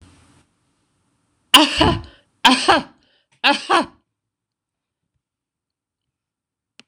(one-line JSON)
{"three_cough_length": "6.9 s", "three_cough_amplitude": 26028, "three_cough_signal_mean_std_ratio": 0.29, "survey_phase": "beta (2021-08-13 to 2022-03-07)", "age": "65+", "gender": "Female", "wearing_mask": "No", "symptom_none": true, "smoker_status": "Ex-smoker", "respiratory_condition_asthma": false, "respiratory_condition_other": false, "recruitment_source": "REACT", "submission_delay": "0 days", "covid_test_result": "Negative", "covid_test_method": "RT-qPCR", "influenza_a_test_result": "Unknown/Void", "influenza_b_test_result": "Unknown/Void"}